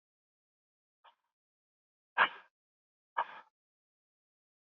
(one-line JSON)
{"exhalation_length": "4.6 s", "exhalation_amplitude": 7202, "exhalation_signal_mean_std_ratio": 0.15, "survey_phase": "beta (2021-08-13 to 2022-03-07)", "age": "45-64", "gender": "Male", "wearing_mask": "No", "symptom_none": true, "smoker_status": "Never smoked", "respiratory_condition_asthma": false, "respiratory_condition_other": false, "recruitment_source": "REACT", "submission_delay": "3 days", "covid_test_result": "Negative", "covid_test_method": "RT-qPCR", "influenza_a_test_result": "Negative", "influenza_b_test_result": "Negative"}